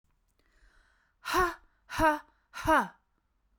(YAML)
exhalation_length: 3.6 s
exhalation_amplitude: 7383
exhalation_signal_mean_std_ratio: 0.36
survey_phase: beta (2021-08-13 to 2022-03-07)
age: 45-64
gender: Female
wearing_mask: 'No'
symptom_none: true
smoker_status: Ex-smoker
respiratory_condition_asthma: false
respiratory_condition_other: false
recruitment_source: REACT
submission_delay: 4 days
covid_test_result: Negative
covid_test_method: RT-qPCR